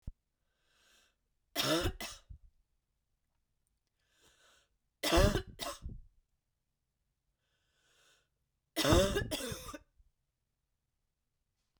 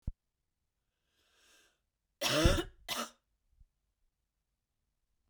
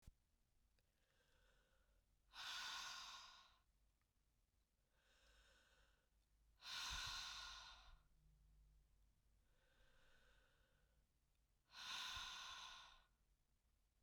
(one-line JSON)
{"three_cough_length": "11.8 s", "three_cough_amplitude": 7053, "three_cough_signal_mean_std_ratio": 0.29, "cough_length": "5.3 s", "cough_amplitude": 6807, "cough_signal_mean_std_ratio": 0.26, "exhalation_length": "14.0 s", "exhalation_amplitude": 357, "exhalation_signal_mean_std_ratio": 0.48, "survey_phase": "beta (2021-08-13 to 2022-03-07)", "age": "45-64", "gender": "Female", "wearing_mask": "No", "symptom_cough_any": true, "symptom_runny_or_blocked_nose": true, "symptom_sore_throat": true, "symptom_fatigue": true, "symptom_headache": true, "smoker_status": "Ex-smoker", "respiratory_condition_asthma": true, "respiratory_condition_other": false, "recruitment_source": "Test and Trace", "submission_delay": "1 day", "covid_test_result": "Positive", "covid_test_method": "LFT"}